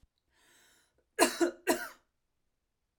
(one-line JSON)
{"cough_length": "3.0 s", "cough_amplitude": 11399, "cough_signal_mean_std_ratio": 0.28, "survey_phase": "alpha (2021-03-01 to 2021-08-12)", "age": "18-44", "gender": "Female", "wearing_mask": "No", "symptom_none": true, "smoker_status": "Never smoked", "respiratory_condition_asthma": true, "respiratory_condition_other": false, "recruitment_source": "REACT", "submission_delay": "1 day", "covid_test_result": "Negative", "covid_test_method": "RT-qPCR"}